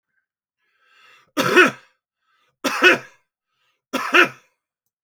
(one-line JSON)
{"three_cough_length": "5.0 s", "three_cough_amplitude": 29935, "three_cough_signal_mean_std_ratio": 0.31, "survey_phase": "beta (2021-08-13 to 2022-03-07)", "age": "65+", "gender": "Male", "wearing_mask": "No", "symptom_none": true, "smoker_status": "Ex-smoker", "respiratory_condition_asthma": false, "respiratory_condition_other": false, "recruitment_source": "REACT", "submission_delay": "2 days", "covid_test_result": "Negative", "covid_test_method": "RT-qPCR"}